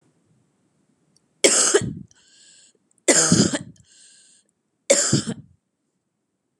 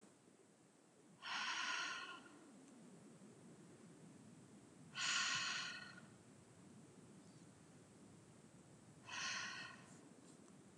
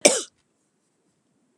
three_cough_length: 6.6 s
three_cough_amplitude: 32398
three_cough_signal_mean_std_ratio: 0.35
exhalation_length: 10.8 s
exhalation_amplitude: 1369
exhalation_signal_mean_std_ratio: 0.56
cough_length: 1.6 s
cough_amplitude: 32768
cough_signal_mean_std_ratio: 0.21
survey_phase: beta (2021-08-13 to 2022-03-07)
age: 18-44
gender: Female
wearing_mask: 'No'
symptom_cough_any: true
symptom_runny_or_blocked_nose: true
symptom_sore_throat: true
symptom_onset: 4 days
smoker_status: Never smoked
respiratory_condition_asthma: false
respiratory_condition_other: false
recruitment_source: REACT
submission_delay: 5 days
covid_test_result: Negative
covid_test_method: RT-qPCR
influenza_a_test_result: Negative
influenza_b_test_result: Negative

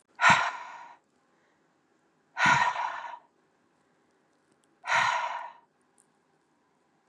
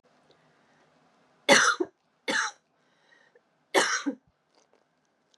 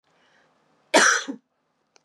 exhalation_length: 7.1 s
exhalation_amplitude: 15117
exhalation_signal_mean_std_ratio: 0.35
three_cough_length: 5.4 s
three_cough_amplitude: 20024
three_cough_signal_mean_std_ratio: 0.3
cough_length: 2.0 s
cough_amplitude: 23873
cough_signal_mean_std_ratio: 0.31
survey_phase: beta (2021-08-13 to 2022-03-07)
age: 45-64
gender: Female
wearing_mask: 'No'
symptom_cough_any: true
symptom_runny_or_blocked_nose: true
symptom_sore_throat: true
symptom_fatigue: true
symptom_headache: true
symptom_onset: 3 days
smoker_status: Ex-smoker
respiratory_condition_asthma: false
respiratory_condition_other: false
recruitment_source: Test and Trace
submission_delay: 2 days
covid_test_result: Positive
covid_test_method: RT-qPCR
covid_ct_value: 22.6
covid_ct_gene: N gene
covid_ct_mean: 23.0
covid_viral_load: 29000 copies/ml
covid_viral_load_category: Low viral load (10K-1M copies/ml)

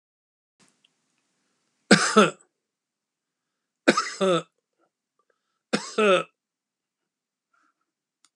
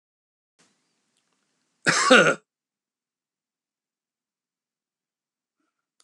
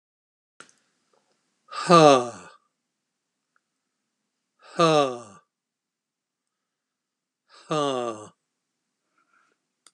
three_cough_length: 8.4 s
three_cough_amplitude: 28646
three_cough_signal_mean_std_ratio: 0.26
cough_length: 6.0 s
cough_amplitude: 27546
cough_signal_mean_std_ratio: 0.2
exhalation_length: 9.9 s
exhalation_amplitude: 27326
exhalation_signal_mean_std_ratio: 0.23
survey_phase: beta (2021-08-13 to 2022-03-07)
age: 65+
gender: Male
wearing_mask: 'No'
symptom_none: true
smoker_status: Ex-smoker
respiratory_condition_asthma: false
respiratory_condition_other: false
recruitment_source: REACT
submission_delay: 2 days
covid_test_result: Negative
covid_test_method: RT-qPCR
influenza_a_test_result: Negative
influenza_b_test_result: Negative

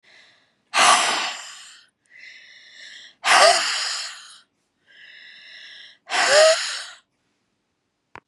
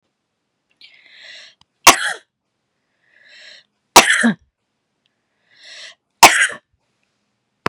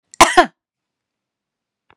exhalation_length: 8.3 s
exhalation_amplitude: 29988
exhalation_signal_mean_std_ratio: 0.4
three_cough_length: 7.7 s
three_cough_amplitude: 32768
three_cough_signal_mean_std_ratio: 0.24
cough_length: 2.0 s
cough_amplitude: 32768
cough_signal_mean_std_ratio: 0.23
survey_phase: beta (2021-08-13 to 2022-03-07)
age: 45-64
gender: Female
wearing_mask: 'No'
symptom_none: true
smoker_status: Never smoked
respiratory_condition_asthma: true
respiratory_condition_other: false
recruitment_source: REACT
submission_delay: 1 day
covid_test_result: Negative
covid_test_method: RT-qPCR
influenza_a_test_result: Negative
influenza_b_test_result: Negative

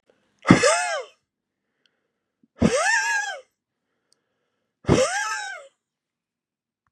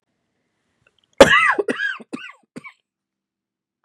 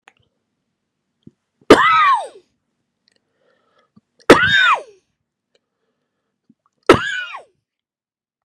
exhalation_length: 6.9 s
exhalation_amplitude: 32768
exhalation_signal_mean_std_ratio: 0.38
cough_length: 3.8 s
cough_amplitude: 32768
cough_signal_mean_std_ratio: 0.28
three_cough_length: 8.4 s
three_cough_amplitude: 32768
three_cough_signal_mean_std_ratio: 0.3
survey_phase: beta (2021-08-13 to 2022-03-07)
age: 65+
gender: Male
wearing_mask: 'No'
symptom_new_continuous_cough: true
symptom_runny_or_blocked_nose: true
symptom_sore_throat: true
symptom_headache: true
symptom_other: true
symptom_onset: 6 days
smoker_status: Ex-smoker
respiratory_condition_asthma: false
respiratory_condition_other: false
recruitment_source: Test and Trace
submission_delay: 1 day
covid_test_result: Positive
covid_test_method: RT-qPCR
covid_ct_value: 15.7
covid_ct_gene: ORF1ab gene
covid_ct_mean: 16.0
covid_viral_load: 5800000 copies/ml
covid_viral_load_category: High viral load (>1M copies/ml)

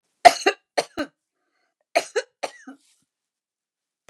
cough_length: 4.1 s
cough_amplitude: 32768
cough_signal_mean_std_ratio: 0.19
survey_phase: beta (2021-08-13 to 2022-03-07)
age: 65+
gender: Female
wearing_mask: 'No'
symptom_none: true
smoker_status: Ex-smoker
respiratory_condition_asthma: false
respiratory_condition_other: false
recruitment_source: REACT
submission_delay: 2 days
covid_test_result: Negative
covid_test_method: RT-qPCR
influenza_a_test_result: Negative
influenza_b_test_result: Negative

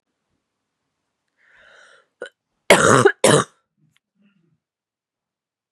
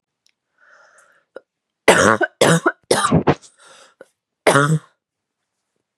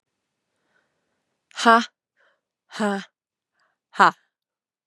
cough_length: 5.7 s
cough_amplitude: 32768
cough_signal_mean_std_ratio: 0.25
three_cough_length: 6.0 s
three_cough_amplitude: 32768
three_cough_signal_mean_std_ratio: 0.36
exhalation_length: 4.9 s
exhalation_amplitude: 29623
exhalation_signal_mean_std_ratio: 0.22
survey_phase: beta (2021-08-13 to 2022-03-07)
age: 18-44
gender: Female
wearing_mask: 'No'
symptom_new_continuous_cough: true
symptom_runny_or_blocked_nose: true
symptom_sore_throat: true
symptom_fatigue: true
symptom_headache: true
symptom_change_to_sense_of_smell_or_taste: true
symptom_onset: 3 days
smoker_status: Never smoked
respiratory_condition_asthma: false
respiratory_condition_other: false
recruitment_source: Test and Trace
submission_delay: 2 days
covid_test_result: Positive
covid_test_method: RT-qPCR
covid_ct_value: 10.2
covid_ct_gene: ORF1ab gene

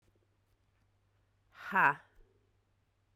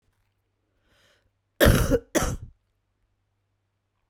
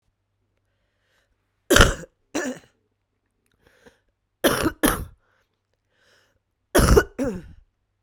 exhalation_length: 3.2 s
exhalation_amplitude: 7616
exhalation_signal_mean_std_ratio: 0.22
cough_length: 4.1 s
cough_amplitude: 18137
cough_signal_mean_std_ratio: 0.29
three_cough_length: 8.0 s
three_cough_amplitude: 32768
three_cough_signal_mean_std_ratio: 0.29
survey_phase: beta (2021-08-13 to 2022-03-07)
age: 45-64
gender: Female
wearing_mask: 'No'
symptom_cough_any: true
symptom_runny_or_blocked_nose: true
symptom_fatigue: true
symptom_fever_high_temperature: true
symptom_headache: true
symptom_other: true
symptom_onset: 3 days
smoker_status: Current smoker (e-cigarettes or vapes only)
respiratory_condition_asthma: false
respiratory_condition_other: false
recruitment_source: Test and Trace
submission_delay: 1 day
covid_test_result: Positive
covid_test_method: RT-qPCR
covid_ct_value: 29.1
covid_ct_gene: ORF1ab gene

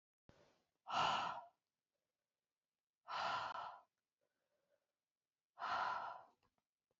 exhalation_length: 7.0 s
exhalation_amplitude: 1548
exhalation_signal_mean_std_ratio: 0.4
survey_phase: beta (2021-08-13 to 2022-03-07)
age: 18-44
gender: Female
wearing_mask: 'No'
symptom_cough_any: true
symptom_runny_or_blocked_nose: true
symptom_shortness_of_breath: true
symptom_sore_throat: true
symptom_fatigue: true
symptom_headache: true
symptom_change_to_sense_of_smell_or_taste: true
symptom_loss_of_taste: true
symptom_other: true
symptom_onset: 2 days
smoker_status: Never smoked
respiratory_condition_asthma: false
respiratory_condition_other: true
recruitment_source: Test and Trace
submission_delay: 2 days
covid_test_result: Positive
covid_test_method: RT-qPCR
covid_ct_value: 20.7
covid_ct_gene: N gene
covid_ct_mean: 20.8
covid_viral_load: 150000 copies/ml
covid_viral_load_category: Low viral load (10K-1M copies/ml)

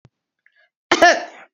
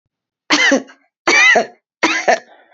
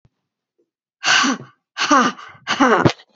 cough_length: 1.5 s
cough_amplitude: 31301
cough_signal_mean_std_ratio: 0.32
three_cough_length: 2.7 s
three_cough_amplitude: 32154
three_cough_signal_mean_std_ratio: 0.52
exhalation_length: 3.2 s
exhalation_amplitude: 29074
exhalation_signal_mean_std_ratio: 0.47
survey_phase: beta (2021-08-13 to 2022-03-07)
age: 45-64
gender: Female
wearing_mask: 'No'
symptom_cough_any: true
symptom_runny_or_blocked_nose: true
symptom_sore_throat: true
symptom_headache: true
symptom_onset: 8 days
smoker_status: Never smoked
respiratory_condition_asthma: false
respiratory_condition_other: false
recruitment_source: REACT
submission_delay: 1 day
covid_test_result: Negative
covid_test_method: RT-qPCR
influenza_a_test_result: Negative
influenza_b_test_result: Negative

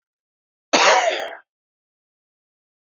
cough_length: 3.0 s
cough_amplitude: 31418
cough_signal_mean_std_ratio: 0.33
survey_phase: beta (2021-08-13 to 2022-03-07)
age: 45-64
gender: Male
wearing_mask: 'No'
symptom_runny_or_blocked_nose: true
symptom_sore_throat: true
symptom_diarrhoea: true
symptom_fatigue: true
symptom_fever_high_temperature: true
symptom_headache: true
symptom_onset: 4 days
smoker_status: Current smoker (1 to 10 cigarettes per day)
respiratory_condition_asthma: false
respiratory_condition_other: false
recruitment_source: Test and Trace
submission_delay: 2 days
covid_test_result: Positive
covid_test_method: ePCR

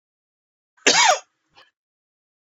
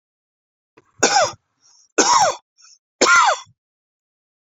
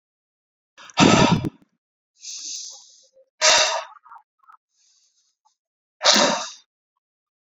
cough_length: 2.6 s
cough_amplitude: 30040
cough_signal_mean_std_ratio: 0.28
three_cough_length: 4.5 s
three_cough_amplitude: 29262
three_cough_signal_mean_std_ratio: 0.39
exhalation_length: 7.4 s
exhalation_amplitude: 32767
exhalation_signal_mean_std_ratio: 0.34
survey_phase: beta (2021-08-13 to 2022-03-07)
age: 45-64
gender: Male
wearing_mask: 'No'
symptom_none: true
smoker_status: Ex-smoker
respiratory_condition_asthma: false
respiratory_condition_other: false
recruitment_source: REACT
submission_delay: 2 days
covid_test_result: Negative
covid_test_method: RT-qPCR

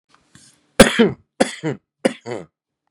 three_cough_length: 2.9 s
three_cough_amplitude: 32768
three_cough_signal_mean_std_ratio: 0.3
survey_phase: beta (2021-08-13 to 2022-03-07)
age: 18-44
gender: Male
wearing_mask: 'No'
symptom_none: true
smoker_status: Current smoker (1 to 10 cigarettes per day)
respiratory_condition_asthma: false
respiratory_condition_other: false
recruitment_source: REACT
submission_delay: 1 day
covid_test_result: Negative
covid_test_method: RT-qPCR
influenza_a_test_result: Negative
influenza_b_test_result: Negative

